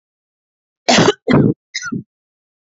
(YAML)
three_cough_length: 2.7 s
three_cough_amplitude: 32768
three_cough_signal_mean_std_ratio: 0.39
survey_phase: beta (2021-08-13 to 2022-03-07)
age: 18-44
gender: Female
wearing_mask: 'No'
symptom_cough_any: true
symptom_runny_or_blocked_nose: true
symptom_sore_throat: true
symptom_diarrhoea: true
symptom_fatigue: true
symptom_fever_high_temperature: true
symptom_headache: true
symptom_onset: 3 days
smoker_status: Ex-smoker
respiratory_condition_asthma: false
respiratory_condition_other: false
recruitment_source: Test and Trace
submission_delay: 2 days
covid_test_result: Positive
covid_test_method: RT-qPCR
covid_ct_value: 33.7
covid_ct_gene: N gene